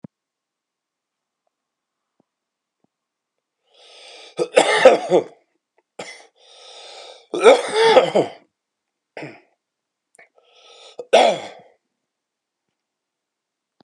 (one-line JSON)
{"three_cough_length": "13.8 s", "three_cough_amplitude": 32768, "three_cough_signal_mean_std_ratio": 0.27, "survey_phase": "beta (2021-08-13 to 2022-03-07)", "age": "45-64", "gender": "Male", "wearing_mask": "No", "symptom_cough_any": true, "symptom_runny_or_blocked_nose": true, "symptom_shortness_of_breath": true, "symptom_abdominal_pain": true, "symptom_fatigue": true, "symptom_fever_high_temperature": true, "symptom_headache": true, "smoker_status": "Never smoked", "respiratory_condition_asthma": false, "respiratory_condition_other": true, "recruitment_source": "Test and Trace", "submission_delay": "2 days", "covid_test_result": "Positive", "covid_test_method": "RT-qPCR", "covid_ct_value": 14.8, "covid_ct_gene": "ORF1ab gene", "covid_ct_mean": 15.1, "covid_viral_load": "11000000 copies/ml", "covid_viral_load_category": "High viral load (>1M copies/ml)"}